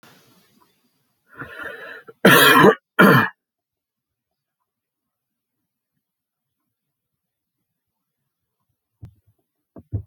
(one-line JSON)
{"cough_length": "10.1 s", "cough_amplitude": 30577, "cough_signal_mean_std_ratio": 0.24, "survey_phase": "alpha (2021-03-01 to 2021-08-12)", "age": "65+", "gender": "Male", "wearing_mask": "No", "symptom_none": true, "symptom_onset": "12 days", "smoker_status": "Ex-smoker", "respiratory_condition_asthma": true, "respiratory_condition_other": false, "recruitment_source": "REACT", "submission_delay": "3 days", "covid_test_result": "Negative", "covid_test_method": "RT-qPCR"}